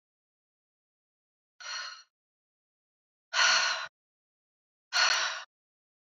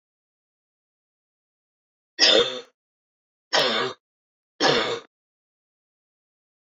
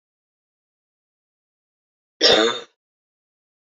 {
  "exhalation_length": "6.1 s",
  "exhalation_amplitude": 8161,
  "exhalation_signal_mean_std_ratio": 0.33,
  "three_cough_length": "6.7 s",
  "three_cough_amplitude": 21121,
  "three_cough_signal_mean_std_ratio": 0.31,
  "cough_length": "3.7 s",
  "cough_amplitude": 28113,
  "cough_signal_mean_std_ratio": 0.24,
  "survey_phase": "beta (2021-08-13 to 2022-03-07)",
  "age": "45-64",
  "gender": "Female",
  "wearing_mask": "No",
  "symptom_cough_any": true,
  "symptom_runny_or_blocked_nose": true,
  "symptom_sore_throat": true,
  "symptom_fatigue": true,
  "symptom_headache": true,
  "smoker_status": "Never smoked",
  "respiratory_condition_asthma": false,
  "respiratory_condition_other": false,
  "recruitment_source": "Test and Trace",
  "submission_delay": "2 days",
  "covid_test_result": "Positive",
  "covid_test_method": "RT-qPCR",
  "covid_ct_value": 28.6,
  "covid_ct_gene": "ORF1ab gene"
}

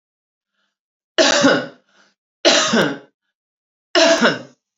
{
  "three_cough_length": "4.8 s",
  "three_cough_amplitude": 32767,
  "three_cough_signal_mean_std_ratio": 0.44,
  "survey_phase": "beta (2021-08-13 to 2022-03-07)",
  "age": "45-64",
  "gender": "Female",
  "wearing_mask": "No",
  "symptom_cough_any": true,
  "symptom_runny_or_blocked_nose": true,
  "symptom_onset": "3 days",
  "smoker_status": "Never smoked",
  "respiratory_condition_asthma": false,
  "respiratory_condition_other": false,
  "recruitment_source": "Test and Trace",
  "submission_delay": "1 day",
  "covid_test_result": "Negative",
  "covid_test_method": "RT-qPCR"
}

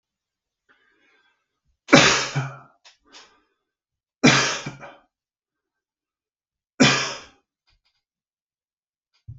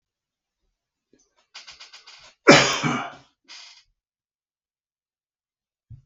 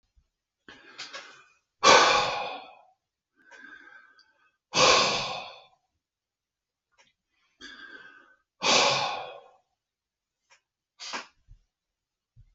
{
  "three_cough_length": "9.4 s",
  "three_cough_amplitude": 32768,
  "three_cough_signal_mean_std_ratio": 0.26,
  "cough_length": "6.1 s",
  "cough_amplitude": 32768,
  "cough_signal_mean_std_ratio": 0.21,
  "exhalation_length": "12.5 s",
  "exhalation_amplitude": 22018,
  "exhalation_signal_mean_std_ratio": 0.31,
  "survey_phase": "beta (2021-08-13 to 2022-03-07)",
  "age": "45-64",
  "gender": "Male",
  "wearing_mask": "No",
  "symptom_none": true,
  "symptom_onset": "12 days",
  "smoker_status": "Ex-smoker",
  "respiratory_condition_asthma": false,
  "respiratory_condition_other": false,
  "recruitment_source": "REACT",
  "submission_delay": "5 days",
  "covid_test_result": "Negative",
  "covid_test_method": "RT-qPCR"
}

